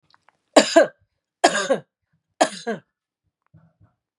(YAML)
three_cough_length: 4.2 s
three_cough_amplitude: 32767
three_cough_signal_mean_std_ratio: 0.28
survey_phase: beta (2021-08-13 to 2022-03-07)
age: 45-64
gender: Female
wearing_mask: 'No'
symptom_none: true
smoker_status: Never smoked
respiratory_condition_asthma: false
respiratory_condition_other: false
recruitment_source: REACT
submission_delay: 1 day
covid_test_result: Negative
covid_test_method: RT-qPCR
influenza_a_test_result: Negative
influenza_b_test_result: Negative